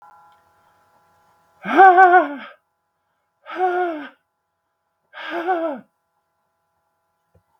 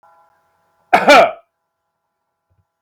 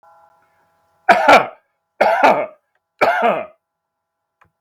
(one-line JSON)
{"exhalation_length": "7.6 s", "exhalation_amplitude": 32768, "exhalation_signal_mean_std_ratio": 0.31, "cough_length": "2.8 s", "cough_amplitude": 32768, "cough_signal_mean_std_ratio": 0.29, "three_cough_length": "4.6 s", "three_cough_amplitude": 32768, "three_cough_signal_mean_std_ratio": 0.4, "survey_phase": "beta (2021-08-13 to 2022-03-07)", "age": "45-64", "gender": "Male", "wearing_mask": "No", "symptom_cough_any": true, "symptom_fatigue": true, "smoker_status": "Never smoked", "respiratory_condition_asthma": false, "respiratory_condition_other": false, "recruitment_source": "REACT", "submission_delay": "12 days", "covid_test_result": "Negative", "covid_test_method": "RT-qPCR", "influenza_a_test_result": "Negative", "influenza_b_test_result": "Negative"}